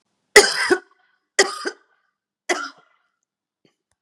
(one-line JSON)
{"three_cough_length": "4.0 s", "three_cough_amplitude": 32768, "three_cough_signal_mean_std_ratio": 0.27, "survey_phase": "beta (2021-08-13 to 2022-03-07)", "age": "45-64", "gender": "Female", "wearing_mask": "No", "symptom_cough_any": true, "symptom_onset": "3 days", "smoker_status": "Never smoked", "respiratory_condition_asthma": false, "respiratory_condition_other": false, "recruitment_source": "Test and Trace", "submission_delay": "2 days", "covid_test_result": "Positive", "covid_test_method": "RT-qPCR", "covid_ct_value": 15.5, "covid_ct_gene": "N gene", "covid_ct_mean": 15.7, "covid_viral_load": "6900000 copies/ml", "covid_viral_load_category": "High viral load (>1M copies/ml)"}